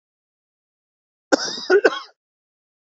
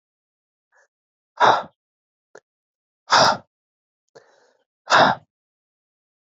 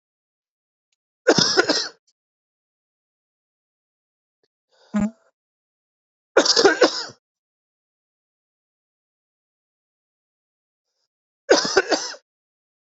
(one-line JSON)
{"cough_length": "3.0 s", "cough_amplitude": 30699, "cough_signal_mean_std_ratio": 0.27, "exhalation_length": "6.2 s", "exhalation_amplitude": 26244, "exhalation_signal_mean_std_ratio": 0.27, "three_cough_length": "12.9 s", "three_cough_amplitude": 28046, "three_cough_signal_mean_std_ratio": 0.26, "survey_phase": "beta (2021-08-13 to 2022-03-07)", "age": "18-44", "gender": "Male", "wearing_mask": "No", "symptom_cough_any": true, "symptom_new_continuous_cough": true, "symptom_fatigue": true, "symptom_headache": true, "symptom_other": true, "smoker_status": "Ex-smoker", "respiratory_condition_asthma": false, "respiratory_condition_other": false, "recruitment_source": "Test and Trace", "submission_delay": "1 day", "covid_test_result": "Positive", "covid_test_method": "RT-qPCR", "covid_ct_value": 21.5, "covid_ct_gene": "ORF1ab gene", "covid_ct_mean": 21.7, "covid_viral_load": "76000 copies/ml", "covid_viral_load_category": "Low viral load (10K-1M copies/ml)"}